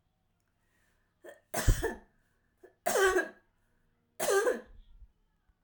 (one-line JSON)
{"three_cough_length": "5.6 s", "three_cough_amplitude": 9022, "three_cough_signal_mean_std_ratio": 0.36, "survey_phase": "alpha (2021-03-01 to 2021-08-12)", "age": "45-64", "gender": "Female", "wearing_mask": "No", "symptom_none": true, "smoker_status": "Never smoked", "respiratory_condition_asthma": false, "respiratory_condition_other": false, "recruitment_source": "REACT", "submission_delay": "1 day", "covid_test_result": "Negative", "covid_test_method": "RT-qPCR"}